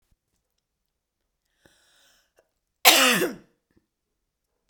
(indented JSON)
{
  "cough_length": "4.7 s",
  "cough_amplitude": 32768,
  "cough_signal_mean_std_ratio": 0.23,
  "survey_phase": "beta (2021-08-13 to 2022-03-07)",
  "age": "45-64",
  "gender": "Female",
  "wearing_mask": "No",
  "symptom_cough_any": true,
  "symptom_runny_or_blocked_nose": true,
  "symptom_diarrhoea": true,
  "symptom_onset": "6 days",
  "smoker_status": "Never smoked",
  "respiratory_condition_asthma": false,
  "respiratory_condition_other": false,
  "recruitment_source": "Test and Trace",
  "submission_delay": "2 days",
  "covid_test_result": "Positive",
  "covid_test_method": "RT-qPCR"
}